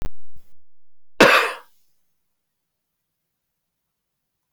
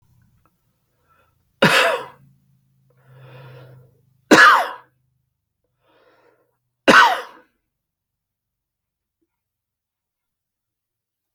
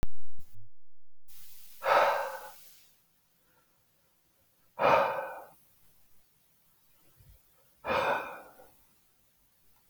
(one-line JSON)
{"cough_length": "4.5 s", "cough_amplitude": 32768, "cough_signal_mean_std_ratio": 0.36, "three_cough_length": "11.3 s", "three_cough_amplitude": 30603, "three_cough_signal_mean_std_ratio": 0.24, "exhalation_length": "9.9 s", "exhalation_amplitude": 9466, "exhalation_signal_mean_std_ratio": 0.43, "survey_phase": "beta (2021-08-13 to 2022-03-07)", "age": "65+", "gender": "Male", "wearing_mask": "No", "symptom_none": true, "smoker_status": "Never smoked", "respiratory_condition_asthma": false, "respiratory_condition_other": false, "recruitment_source": "REACT", "submission_delay": "7 days", "covid_test_result": "Negative", "covid_test_method": "RT-qPCR"}